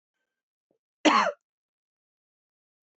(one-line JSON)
{"cough_length": "3.0 s", "cough_amplitude": 14625, "cough_signal_mean_std_ratio": 0.23, "survey_phase": "beta (2021-08-13 to 2022-03-07)", "age": "45-64", "gender": "Female", "wearing_mask": "No", "symptom_cough_any": true, "symptom_runny_or_blocked_nose": true, "symptom_fatigue": true, "smoker_status": "Never smoked", "respiratory_condition_asthma": false, "respiratory_condition_other": false, "recruitment_source": "Test and Trace", "submission_delay": "1 day", "covid_test_result": "Positive", "covid_test_method": "LFT"}